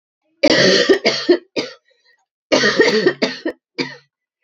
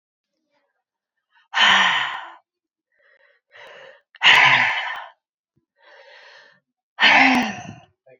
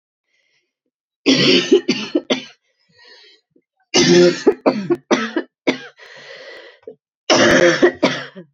{"three_cough_length": "4.4 s", "three_cough_amplitude": 32767, "three_cough_signal_mean_std_ratio": 0.52, "exhalation_length": "8.2 s", "exhalation_amplitude": 28793, "exhalation_signal_mean_std_ratio": 0.38, "cough_length": "8.5 s", "cough_amplitude": 32685, "cough_signal_mean_std_ratio": 0.46, "survey_phase": "beta (2021-08-13 to 2022-03-07)", "age": "18-44", "gender": "Female", "wearing_mask": "No", "symptom_cough_any": true, "symptom_runny_or_blocked_nose": true, "symptom_fatigue": true, "symptom_headache": true, "symptom_change_to_sense_of_smell_or_taste": true, "smoker_status": "Never smoked", "respiratory_condition_asthma": false, "respiratory_condition_other": false, "recruitment_source": "Test and Trace", "submission_delay": "1 day", "covid_test_result": "Positive", "covid_test_method": "RT-qPCR", "covid_ct_value": 24.4, "covid_ct_gene": "ORF1ab gene"}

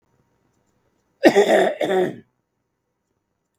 {"cough_length": "3.6 s", "cough_amplitude": 32768, "cough_signal_mean_std_ratio": 0.36, "survey_phase": "beta (2021-08-13 to 2022-03-07)", "age": "65+", "gender": "Male", "wearing_mask": "No", "symptom_none": true, "smoker_status": "Never smoked", "respiratory_condition_asthma": false, "respiratory_condition_other": false, "recruitment_source": "REACT", "submission_delay": "1 day", "covid_test_result": "Negative", "covid_test_method": "RT-qPCR"}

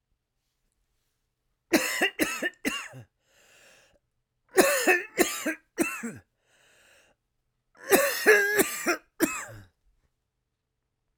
{"three_cough_length": "11.2 s", "three_cough_amplitude": 21007, "three_cough_signal_mean_std_ratio": 0.38, "survey_phase": "beta (2021-08-13 to 2022-03-07)", "age": "18-44", "gender": "Male", "wearing_mask": "No", "symptom_cough_any": true, "symptom_runny_or_blocked_nose": true, "symptom_shortness_of_breath": true, "symptom_sore_throat": true, "symptom_fatigue": true, "symptom_headache": true, "symptom_loss_of_taste": true, "symptom_other": true, "smoker_status": "Ex-smoker", "respiratory_condition_asthma": false, "respiratory_condition_other": false, "recruitment_source": "Test and Trace", "submission_delay": "1 day", "covid_test_result": "Positive", "covid_test_method": "RT-qPCR", "covid_ct_value": 20.3, "covid_ct_gene": "ORF1ab gene"}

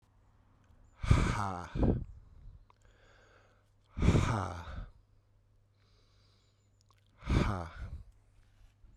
{"exhalation_length": "9.0 s", "exhalation_amplitude": 8362, "exhalation_signal_mean_std_ratio": 0.39, "survey_phase": "beta (2021-08-13 to 2022-03-07)", "age": "18-44", "gender": "Male", "wearing_mask": "No", "symptom_none": true, "smoker_status": "Ex-smoker", "respiratory_condition_asthma": false, "respiratory_condition_other": false, "recruitment_source": "REACT", "submission_delay": "3 days", "covid_test_result": "Negative", "covid_test_method": "RT-qPCR"}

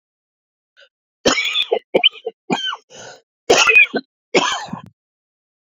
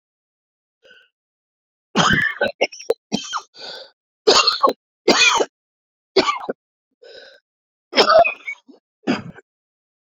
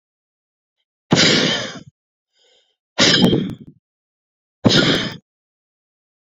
{"cough_length": "5.6 s", "cough_amplitude": 32618, "cough_signal_mean_std_ratio": 0.4, "three_cough_length": "10.1 s", "three_cough_amplitude": 29730, "three_cough_signal_mean_std_ratio": 0.38, "exhalation_length": "6.4 s", "exhalation_amplitude": 30626, "exhalation_signal_mean_std_ratio": 0.39, "survey_phase": "beta (2021-08-13 to 2022-03-07)", "age": "45-64", "gender": "Male", "wearing_mask": "No", "symptom_cough_any": true, "symptom_runny_or_blocked_nose": true, "symptom_shortness_of_breath": true, "symptom_fatigue": true, "symptom_fever_high_temperature": true, "symptom_headache": true, "symptom_change_to_sense_of_smell_or_taste": true, "symptom_onset": "2 days", "smoker_status": "Ex-smoker", "respiratory_condition_asthma": false, "respiratory_condition_other": false, "recruitment_source": "Test and Trace", "submission_delay": "2 days", "covid_test_result": "Positive", "covid_test_method": "RT-qPCR", "covid_ct_value": 20.8, "covid_ct_gene": "N gene", "covid_ct_mean": 21.4, "covid_viral_load": "94000 copies/ml", "covid_viral_load_category": "Low viral load (10K-1M copies/ml)"}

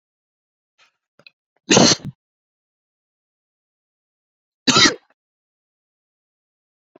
{"cough_length": "7.0 s", "cough_amplitude": 32729, "cough_signal_mean_std_ratio": 0.21, "survey_phase": "beta (2021-08-13 to 2022-03-07)", "age": "18-44", "gender": "Male", "wearing_mask": "No", "symptom_none": true, "smoker_status": "Ex-smoker", "respiratory_condition_asthma": false, "respiratory_condition_other": false, "recruitment_source": "REACT", "submission_delay": "2 days", "covid_test_result": "Negative", "covid_test_method": "RT-qPCR"}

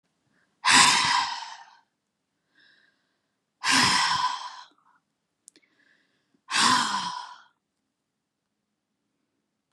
{"exhalation_length": "9.7 s", "exhalation_amplitude": 22182, "exhalation_signal_mean_std_ratio": 0.37, "survey_phase": "beta (2021-08-13 to 2022-03-07)", "age": "65+", "gender": "Female", "wearing_mask": "No", "symptom_none": true, "smoker_status": "Never smoked", "respiratory_condition_asthma": false, "respiratory_condition_other": false, "recruitment_source": "REACT", "submission_delay": "2 days", "covid_test_result": "Negative", "covid_test_method": "RT-qPCR", "influenza_a_test_result": "Negative", "influenza_b_test_result": "Negative"}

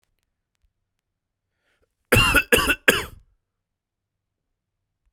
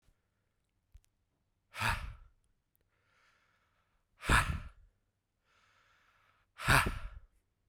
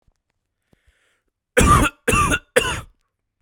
{"cough_length": "5.1 s", "cough_amplitude": 32768, "cough_signal_mean_std_ratio": 0.27, "exhalation_length": "7.7 s", "exhalation_amplitude": 8854, "exhalation_signal_mean_std_ratio": 0.27, "three_cough_length": "3.4 s", "three_cough_amplitude": 32768, "three_cough_signal_mean_std_ratio": 0.39, "survey_phase": "beta (2021-08-13 to 2022-03-07)", "age": "18-44", "gender": "Male", "wearing_mask": "No", "symptom_runny_or_blocked_nose": true, "symptom_shortness_of_breath": true, "symptom_fatigue": true, "symptom_headache": true, "symptom_change_to_sense_of_smell_or_taste": true, "symptom_onset": "4 days", "smoker_status": "Prefer not to say", "respiratory_condition_asthma": false, "respiratory_condition_other": false, "recruitment_source": "Test and Trace", "submission_delay": "2 days", "covid_test_result": "Positive", "covid_test_method": "RT-qPCR", "covid_ct_value": 23.5, "covid_ct_gene": "ORF1ab gene", "covid_ct_mean": 24.2, "covid_viral_load": "11000 copies/ml", "covid_viral_load_category": "Low viral load (10K-1M copies/ml)"}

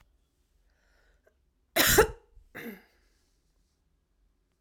{"cough_length": "4.6 s", "cough_amplitude": 13885, "cough_signal_mean_std_ratio": 0.23, "survey_phase": "alpha (2021-03-01 to 2021-08-12)", "age": "18-44", "gender": "Male", "wearing_mask": "No", "symptom_fatigue": true, "symptom_headache": true, "symptom_change_to_sense_of_smell_or_taste": true, "symptom_loss_of_taste": true, "symptom_onset": "5 days", "smoker_status": "Never smoked", "respiratory_condition_asthma": false, "respiratory_condition_other": false, "recruitment_source": "Test and Trace", "submission_delay": "1 day", "covid_test_result": "Positive", "covid_test_method": "RT-qPCR"}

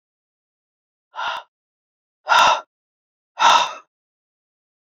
{"exhalation_length": "4.9 s", "exhalation_amplitude": 26765, "exhalation_signal_mean_std_ratio": 0.3, "survey_phase": "beta (2021-08-13 to 2022-03-07)", "age": "45-64", "gender": "Male", "wearing_mask": "No", "symptom_cough_any": true, "symptom_runny_or_blocked_nose": true, "symptom_sore_throat": true, "smoker_status": "Never smoked", "respiratory_condition_asthma": false, "respiratory_condition_other": false, "recruitment_source": "REACT", "submission_delay": "1 day", "covid_test_result": "Negative", "covid_test_method": "RT-qPCR"}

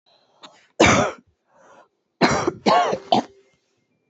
{"three_cough_length": "4.1 s", "three_cough_amplitude": 27911, "three_cough_signal_mean_std_ratio": 0.4, "survey_phase": "beta (2021-08-13 to 2022-03-07)", "age": "18-44", "gender": "Female", "wearing_mask": "No", "symptom_shortness_of_breath": true, "symptom_sore_throat": true, "symptom_headache": true, "symptom_change_to_sense_of_smell_or_taste": true, "symptom_onset": "8 days", "smoker_status": "Current smoker (1 to 10 cigarettes per day)", "respiratory_condition_asthma": true, "respiratory_condition_other": false, "recruitment_source": "REACT", "submission_delay": "0 days", "covid_test_result": "Negative", "covid_test_method": "RT-qPCR"}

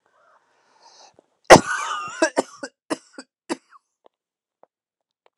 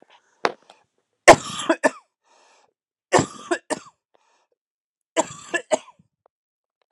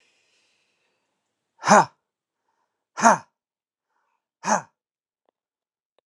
{"cough_length": "5.4 s", "cough_amplitude": 32768, "cough_signal_mean_std_ratio": 0.2, "three_cough_length": "6.9 s", "three_cough_amplitude": 32768, "three_cough_signal_mean_std_ratio": 0.21, "exhalation_length": "6.1 s", "exhalation_amplitude": 31041, "exhalation_signal_mean_std_ratio": 0.2, "survey_phase": "beta (2021-08-13 to 2022-03-07)", "age": "18-44", "gender": "Male", "wearing_mask": "No", "symptom_new_continuous_cough": true, "symptom_runny_or_blocked_nose": true, "symptom_fever_high_temperature": true, "symptom_change_to_sense_of_smell_or_taste": true, "symptom_onset": "2 days", "smoker_status": "Never smoked", "respiratory_condition_asthma": false, "respiratory_condition_other": false, "recruitment_source": "Test and Trace", "submission_delay": "2 days", "covid_test_result": "Positive", "covid_test_method": "RT-qPCR", "covid_ct_value": 23.1, "covid_ct_gene": "ORF1ab gene", "covid_ct_mean": 23.6, "covid_viral_load": "18000 copies/ml", "covid_viral_load_category": "Low viral load (10K-1M copies/ml)"}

